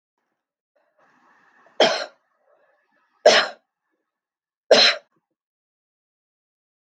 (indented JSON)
{
  "three_cough_length": "7.0 s",
  "three_cough_amplitude": 31610,
  "three_cough_signal_mean_std_ratio": 0.23,
  "survey_phase": "beta (2021-08-13 to 2022-03-07)",
  "age": "45-64",
  "gender": "Female",
  "wearing_mask": "No",
  "symptom_none": true,
  "smoker_status": "Never smoked",
  "respiratory_condition_asthma": false,
  "respiratory_condition_other": false,
  "recruitment_source": "REACT",
  "submission_delay": "3 days",
  "covid_test_result": "Negative",
  "covid_test_method": "RT-qPCR",
  "influenza_a_test_result": "Negative",
  "influenza_b_test_result": "Negative"
}